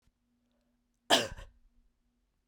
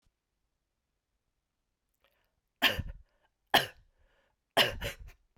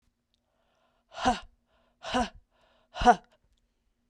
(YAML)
cough_length: 2.5 s
cough_amplitude: 11831
cough_signal_mean_std_ratio: 0.21
three_cough_length: 5.4 s
three_cough_amplitude: 13104
three_cough_signal_mean_std_ratio: 0.24
exhalation_length: 4.1 s
exhalation_amplitude: 14816
exhalation_signal_mean_std_ratio: 0.25
survey_phase: beta (2021-08-13 to 2022-03-07)
age: 45-64
gender: Female
wearing_mask: 'No'
symptom_runny_or_blocked_nose: true
symptom_headache: true
symptom_change_to_sense_of_smell_or_taste: true
symptom_onset: 3 days
smoker_status: Never smoked
respiratory_condition_asthma: false
respiratory_condition_other: false
recruitment_source: Test and Trace
submission_delay: 2 days
covid_test_result: Positive
covid_test_method: RT-qPCR
covid_ct_value: 11.8
covid_ct_gene: ORF1ab gene